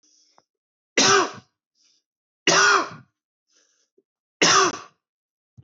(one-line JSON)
{"three_cough_length": "5.6 s", "three_cough_amplitude": 18638, "three_cough_signal_mean_std_ratio": 0.35, "survey_phase": "beta (2021-08-13 to 2022-03-07)", "age": "45-64", "gender": "Male", "wearing_mask": "No", "symptom_cough_any": true, "symptom_fatigue": true, "symptom_headache": true, "smoker_status": "Never smoked", "respiratory_condition_asthma": true, "respiratory_condition_other": false, "recruitment_source": "REACT", "submission_delay": "2 days", "covid_test_result": "Negative", "covid_test_method": "RT-qPCR", "influenza_a_test_result": "Negative", "influenza_b_test_result": "Negative"}